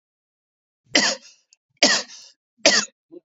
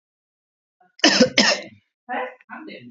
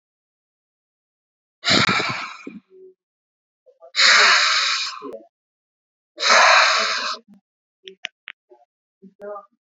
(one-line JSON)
{"three_cough_length": "3.2 s", "three_cough_amplitude": 31245, "three_cough_signal_mean_std_ratio": 0.33, "cough_length": "2.9 s", "cough_amplitude": 32768, "cough_signal_mean_std_ratio": 0.37, "exhalation_length": "9.6 s", "exhalation_amplitude": 29112, "exhalation_signal_mean_std_ratio": 0.41, "survey_phase": "beta (2021-08-13 to 2022-03-07)", "age": "18-44", "gender": "Male", "wearing_mask": "No", "symptom_none": true, "smoker_status": "Never smoked", "respiratory_condition_asthma": false, "respiratory_condition_other": false, "recruitment_source": "REACT", "submission_delay": "1 day", "covid_test_result": "Negative", "covid_test_method": "RT-qPCR"}